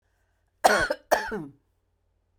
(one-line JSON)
{"cough_length": "2.4 s", "cough_amplitude": 19995, "cough_signal_mean_std_ratio": 0.34, "survey_phase": "beta (2021-08-13 to 2022-03-07)", "age": "45-64", "gender": "Female", "wearing_mask": "No", "symptom_none": true, "smoker_status": "Ex-smoker", "respiratory_condition_asthma": false, "respiratory_condition_other": false, "recruitment_source": "REACT", "submission_delay": "2 days", "covid_test_result": "Negative", "covid_test_method": "RT-qPCR"}